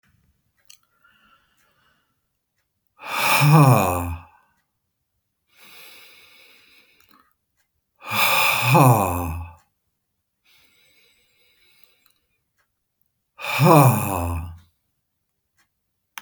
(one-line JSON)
{"exhalation_length": "16.2 s", "exhalation_amplitude": 31120, "exhalation_signal_mean_std_ratio": 0.34, "survey_phase": "beta (2021-08-13 to 2022-03-07)", "age": "65+", "gender": "Male", "wearing_mask": "No", "symptom_none": true, "smoker_status": "Never smoked", "respiratory_condition_asthma": false, "respiratory_condition_other": false, "recruitment_source": "REACT", "submission_delay": "1 day", "covid_test_result": "Negative", "covid_test_method": "RT-qPCR"}